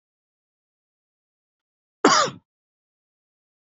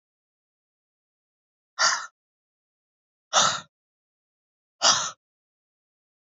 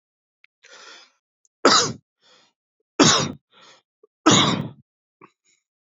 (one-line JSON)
{"cough_length": "3.7 s", "cough_amplitude": 28179, "cough_signal_mean_std_ratio": 0.2, "exhalation_length": "6.3 s", "exhalation_amplitude": 19105, "exhalation_signal_mean_std_ratio": 0.25, "three_cough_length": "5.8 s", "three_cough_amplitude": 28022, "three_cough_signal_mean_std_ratio": 0.31, "survey_phase": "beta (2021-08-13 to 2022-03-07)", "age": "45-64", "gender": "Male", "wearing_mask": "No", "symptom_fatigue": true, "smoker_status": "Never smoked", "respiratory_condition_asthma": false, "respiratory_condition_other": false, "recruitment_source": "REACT", "submission_delay": "3 days", "covid_test_result": "Negative", "covid_test_method": "RT-qPCR", "influenza_a_test_result": "Negative", "influenza_b_test_result": "Negative"}